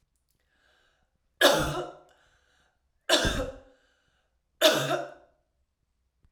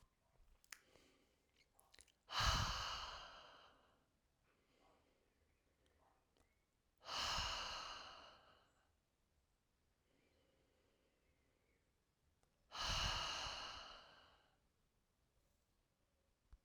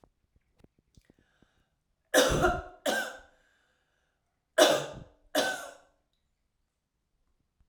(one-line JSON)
{"three_cough_length": "6.3 s", "three_cough_amplitude": 17803, "three_cough_signal_mean_std_ratio": 0.33, "exhalation_length": "16.6 s", "exhalation_amplitude": 1658, "exhalation_signal_mean_std_ratio": 0.36, "cough_length": "7.7 s", "cough_amplitude": 14915, "cough_signal_mean_std_ratio": 0.31, "survey_phase": "alpha (2021-03-01 to 2021-08-12)", "age": "45-64", "gender": "Female", "wearing_mask": "No", "symptom_none": true, "smoker_status": "Ex-smoker", "respiratory_condition_asthma": false, "respiratory_condition_other": false, "recruitment_source": "REACT", "submission_delay": "1 day", "covid_test_result": "Negative", "covid_test_method": "RT-qPCR"}